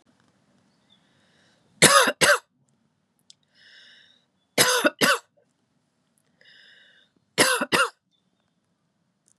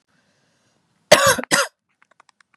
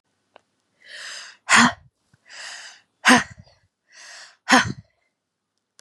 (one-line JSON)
{"three_cough_length": "9.4 s", "three_cough_amplitude": 31544, "three_cough_signal_mean_std_ratio": 0.29, "cough_length": "2.6 s", "cough_amplitude": 32768, "cough_signal_mean_std_ratio": 0.29, "exhalation_length": "5.8 s", "exhalation_amplitude": 32397, "exhalation_signal_mean_std_ratio": 0.28, "survey_phase": "beta (2021-08-13 to 2022-03-07)", "age": "18-44", "gender": "Female", "wearing_mask": "No", "symptom_cough_any": true, "symptom_runny_or_blocked_nose": true, "symptom_sore_throat": true, "symptom_fatigue": true, "symptom_change_to_sense_of_smell_or_taste": true, "symptom_onset": "4 days", "smoker_status": "Never smoked", "respiratory_condition_asthma": false, "respiratory_condition_other": false, "recruitment_source": "Test and Trace", "submission_delay": "2 days", "covid_test_result": "Positive", "covid_test_method": "ePCR"}